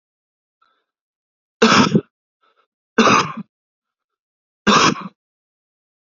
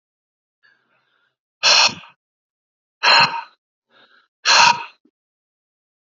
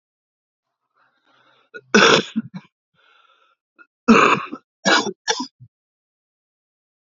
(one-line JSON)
{"three_cough_length": "6.1 s", "three_cough_amplitude": 32767, "three_cough_signal_mean_std_ratio": 0.32, "exhalation_length": "6.1 s", "exhalation_amplitude": 30245, "exhalation_signal_mean_std_ratio": 0.31, "cough_length": "7.2 s", "cough_amplitude": 29655, "cough_signal_mean_std_ratio": 0.3, "survey_phase": "alpha (2021-03-01 to 2021-08-12)", "age": "18-44", "gender": "Male", "wearing_mask": "No", "symptom_cough_any": true, "symptom_fatigue": true, "symptom_fever_high_temperature": true, "symptom_headache": true, "symptom_loss_of_taste": true, "symptom_onset": "3 days", "smoker_status": "Never smoked", "respiratory_condition_asthma": false, "respiratory_condition_other": false, "recruitment_source": "Test and Trace", "submission_delay": "2 days", "covid_test_result": "Positive", "covid_test_method": "RT-qPCR", "covid_ct_value": 23.4, "covid_ct_gene": "ORF1ab gene", "covid_ct_mean": 24.4, "covid_viral_load": "10000 copies/ml", "covid_viral_load_category": "Low viral load (10K-1M copies/ml)"}